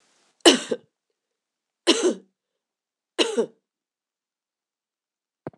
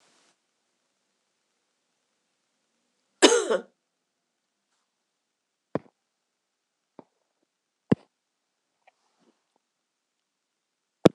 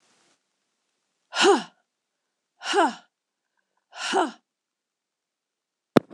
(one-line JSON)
{"three_cough_length": "5.6 s", "three_cough_amplitude": 26028, "three_cough_signal_mean_std_ratio": 0.25, "cough_length": "11.1 s", "cough_amplitude": 26028, "cough_signal_mean_std_ratio": 0.13, "exhalation_length": "6.1 s", "exhalation_amplitude": 26028, "exhalation_signal_mean_std_ratio": 0.27, "survey_phase": "beta (2021-08-13 to 2022-03-07)", "age": "65+", "gender": "Male", "wearing_mask": "No", "symptom_cough_any": true, "symptom_new_continuous_cough": true, "symptom_runny_or_blocked_nose": true, "symptom_sore_throat": true, "smoker_status": "Ex-smoker", "respiratory_condition_asthma": false, "respiratory_condition_other": true, "recruitment_source": "Test and Trace", "submission_delay": "2 days", "covid_test_result": "Negative", "covid_test_method": "ePCR"}